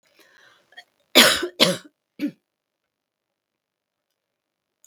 {"cough_length": "4.9 s", "cough_amplitude": 32768, "cough_signal_mean_std_ratio": 0.23, "survey_phase": "beta (2021-08-13 to 2022-03-07)", "age": "65+", "gender": "Female", "wearing_mask": "No", "symptom_cough_any": true, "smoker_status": "Never smoked", "respiratory_condition_asthma": false, "respiratory_condition_other": false, "recruitment_source": "REACT", "submission_delay": "0 days", "covid_test_result": "Negative", "covid_test_method": "RT-qPCR", "influenza_a_test_result": "Negative", "influenza_b_test_result": "Negative"}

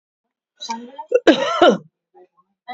{"cough_length": "2.7 s", "cough_amplitude": 32767, "cough_signal_mean_std_ratio": 0.37, "survey_phase": "alpha (2021-03-01 to 2021-08-12)", "age": "18-44", "gender": "Female", "wearing_mask": "No", "symptom_none": true, "symptom_cough_any": true, "smoker_status": "Current smoker (e-cigarettes or vapes only)", "respiratory_condition_asthma": false, "respiratory_condition_other": false, "recruitment_source": "REACT", "submission_delay": "2 days", "covid_test_result": "Negative", "covid_test_method": "RT-qPCR"}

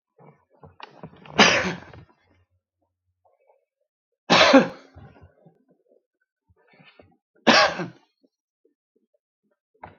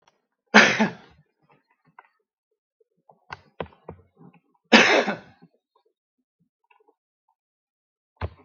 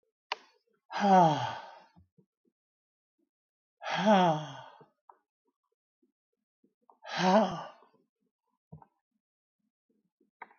{"three_cough_length": "10.0 s", "three_cough_amplitude": 32766, "three_cough_signal_mean_std_ratio": 0.25, "cough_length": "8.4 s", "cough_amplitude": 32768, "cough_signal_mean_std_ratio": 0.23, "exhalation_length": "10.6 s", "exhalation_amplitude": 9772, "exhalation_signal_mean_std_ratio": 0.3, "survey_phase": "beta (2021-08-13 to 2022-03-07)", "age": "65+", "gender": "Male", "wearing_mask": "No", "symptom_none": true, "smoker_status": "Ex-smoker", "respiratory_condition_asthma": false, "respiratory_condition_other": false, "recruitment_source": "REACT", "submission_delay": "17 days", "covid_test_result": "Negative", "covid_test_method": "RT-qPCR", "influenza_a_test_result": "Negative", "influenza_b_test_result": "Negative"}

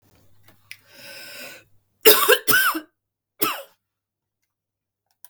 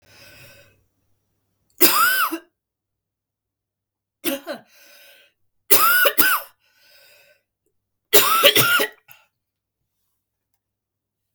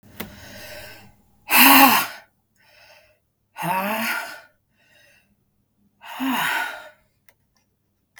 {"cough_length": "5.3 s", "cough_amplitude": 32768, "cough_signal_mean_std_ratio": 0.3, "three_cough_length": "11.3 s", "three_cough_amplitude": 32768, "three_cough_signal_mean_std_ratio": 0.34, "exhalation_length": "8.2 s", "exhalation_amplitude": 32768, "exhalation_signal_mean_std_ratio": 0.34, "survey_phase": "beta (2021-08-13 to 2022-03-07)", "age": "45-64", "gender": "Female", "wearing_mask": "No", "symptom_cough_any": true, "symptom_runny_or_blocked_nose": true, "symptom_sore_throat": true, "symptom_headache": true, "smoker_status": "Never smoked", "respiratory_condition_asthma": false, "respiratory_condition_other": false, "recruitment_source": "Test and Trace", "submission_delay": "1 day", "covid_test_result": "Positive", "covid_test_method": "RT-qPCR", "covid_ct_value": 23.3, "covid_ct_gene": "ORF1ab gene"}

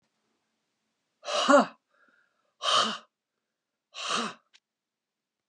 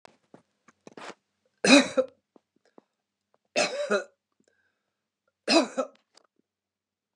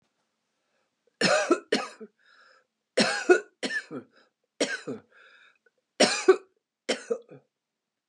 {"exhalation_length": "5.5 s", "exhalation_amplitude": 13820, "exhalation_signal_mean_std_ratio": 0.3, "three_cough_length": "7.2 s", "three_cough_amplitude": 21627, "three_cough_signal_mean_std_ratio": 0.26, "cough_length": "8.1 s", "cough_amplitude": 17682, "cough_signal_mean_std_ratio": 0.33, "survey_phase": "beta (2021-08-13 to 2022-03-07)", "age": "65+", "gender": "Female", "wearing_mask": "No", "symptom_runny_or_blocked_nose": true, "symptom_onset": "5 days", "smoker_status": "Ex-smoker", "respiratory_condition_asthma": false, "respiratory_condition_other": false, "recruitment_source": "REACT", "submission_delay": "3 days", "covid_test_result": "Negative", "covid_test_method": "RT-qPCR", "influenza_a_test_result": "Negative", "influenza_b_test_result": "Negative"}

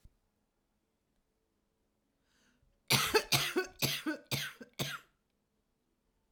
{"cough_length": "6.3 s", "cough_amplitude": 10064, "cough_signal_mean_std_ratio": 0.33, "survey_phase": "beta (2021-08-13 to 2022-03-07)", "age": "45-64", "gender": "Female", "wearing_mask": "No", "symptom_cough_any": true, "symptom_fatigue": true, "symptom_loss_of_taste": true, "smoker_status": "Current smoker (1 to 10 cigarettes per day)", "respiratory_condition_asthma": false, "respiratory_condition_other": false, "recruitment_source": "Test and Trace", "submission_delay": "1 day", "covid_test_result": "Positive", "covid_test_method": "RT-qPCR", "covid_ct_value": 20.6, "covid_ct_gene": "ORF1ab gene"}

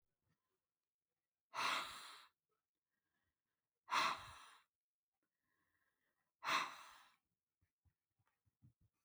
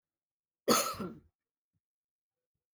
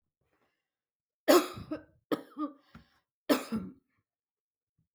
{"exhalation_length": "9.0 s", "exhalation_amplitude": 2034, "exhalation_signal_mean_std_ratio": 0.28, "cough_length": "2.7 s", "cough_amplitude": 7847, "cough_signal_mean_std_ratio": 0.26, "three_cough_length": "4.9 s", "three_cough_amplitude": 11150, "three_cough_signal_mean_std_ratio": 0.26, "survey_phase": "beta (2021-08-13 to 2022-03-07)", "age": "65+", "gender": "Female", "wearing_mask": "No", "symptom_none": true, "smoker_status": "Never smoked", "respiratory_condition_asthma": false, "respiratory_condition_other": false, "recruitment_source": "REACT", "submission_delay": "2 days", "covid_test_result": "Negative", "covid_test_method": "RT-qPCR"}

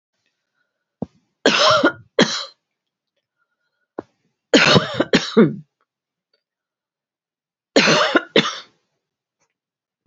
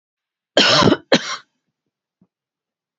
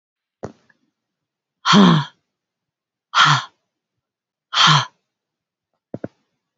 {"three_cough_length": "10.1 s", "three_cough_amplitude": 31141, "three_cough_signal_mean_std_ratio": 0.34, "cough_length": "3.0 s", "cough_amplitude": 32416, "cough_signal_mean_std_ratio": 0.33, "exhalation_length": "6.6 s", "exhalation_amplitude": 29099, "exhalation_signal_mean_std_ratio": 0.31, "survey_phase": "beta (2021-08-13 to 2022-03-07)", "age": "45-64", "gender": "Female", "wearing_mask": "No", "symptom_none": true, "smoker_status": "Ex-smoker", "recruitment_source": "REACT", "submission_delay": "2 days", "covid_test_result": "Negative", "covid_test_method": "RT-qPCR", "influenza_a_test_result": "Negative", "influenza_b_test_result": "Negative"}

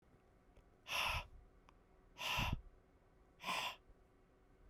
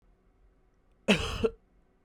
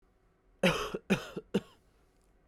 {"exhalation_length": "4.7 s", "exhalation_amplitude": 1588, "exhalation_signal_mean_std_ratio": 0.46, "cough_length": "2.0 s", "cough_amplitude": 12876, "cough_signal_mean_std_ratio": 0.32, "three_cough_length": "2.5 s", "three_cough_amplitude": 7509, "three_cough_signal_mean_std_ratio": 0.35, "survey_phase": "beta (2021-08-13 to 2022-03-07)", "age": "18-44", "gender": "Male", "wearing_mask": "No", "symptom_cough_any": true, "symptom_new_continuous_cough": true, "symptom_runny_or_blocked_nose": true, "symptom_shortness_of_breath": true, "symptom_fatigue": true, "symptom_fever_high_temperature": true, "symptom_headache": true, "symptom_change_to_sense_of_smell_or_taste": true, "symptom_loss_of_taste": true, "symptom_onset": "3 days", "smoker_status": "Never smoked", "respiratory_condition_asthma": false, "respiratory_condition_other": false, "recruitment_source": "Test and Trace", "submission_delay": "1 day", "covid_test_result": "Positive", "covid_test_method": "RT-qPCR"}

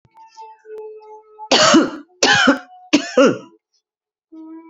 {"three_cough_length": "4.7 s", "three_cough_amplitude": 32768, "three_cough_signal_mean_std_ratio": 0.43, "survey_phase": "beta (2021-08-13 to 2022-03-07)", "age": "18-44", "gender": "Female", "wearing_mask": "No", "symptom_cough_any": true, "symptom_runny_or_blocked_nose": true, "symptom_sore_throat": true, "symptom_fatigue": true, "symptom_fever_high_temperature": true, "symptom_onset": "2 days", "smoker_status": "Never smoked", "respiratory_condition_asthma": false, "respiratory_condition_other": false, "recruitment_source": "Test and Trace", "submission_delay": "1 day", "covid_test_result": "Negative", "covid_test_method": "ePCR"}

